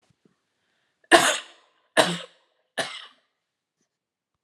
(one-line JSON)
{"three_cough_length": "4.4 s", "three_cough_amplitude": 32767, "three_cough_signal_mean_std_ratio": 0.25, "survey_phase": "alpha (2021-03-01 to 2021-08-12)", "age": "18-44", "gender": "Female", "wearing_mask": "No", "symptom_none": true, "symptom_onset": "12 days", "smoker_status": "Never smoked", "respiratory_condition_asthma": false, "respiratory_condition_other": false, "recruitment_source": "REACT", "submission_delay": "1 day", "covid_test_result": "Negative", "covid_test_method": "RT-qPCR"}